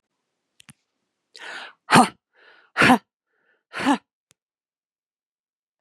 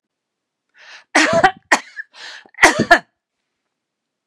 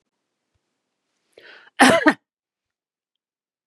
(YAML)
exhalation_length: 5.8 s
exhalation_amplitude: 30529
exhalation_signal_mean_std_ratio: 0.23
three_cough_length: 4.3 s
three_cough_amplitude: 32768
three_cough_signal_mean_std_ratio: 0.32
cough_length: 3.7 s
cough_amplitude: 32767
cough_signal_mean_std_ratio: 0.22
survey_phase: beta (2021-08-13 to 2022-03-07)
age: 45-64
gender: Female
wearing_mask: 'No'
symptom_none: true
smoker_status: Ex-smoker
respiratory_condition_asthma: false
respiratory_condition_other: false
recruitment_source: REACT
submission_delay: 7 days
covid_test_result: Negative
covid_test_method: RT-qPCR
influenza_a_test_result: Negative
influenza_b_test_result: Negative